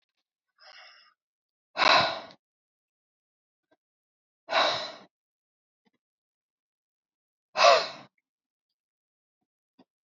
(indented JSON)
{
  "exhalation_length": "10.1 s",
  "exhalation_amplitude": 17893,
  "exhalation_signal_mean_std_ratio": 0.24,
  "survey_phase": "beta (2021-08-13 to 2022-03-07)",
  "age": "45-64",
  "gender": "Female",
  "wearing_mask": "No",
  "symptom_none": true,
  "smoker_status": "Never smoked",
  "respiratory_condition_asthma": false,
  "respiratory_condition_other": false,
  "recruitment_source": "REACT",
  "submission_delay": "2 days",
  "covid_test_result": "Negative",
  "covid_test_method": "RT-qPCR"
}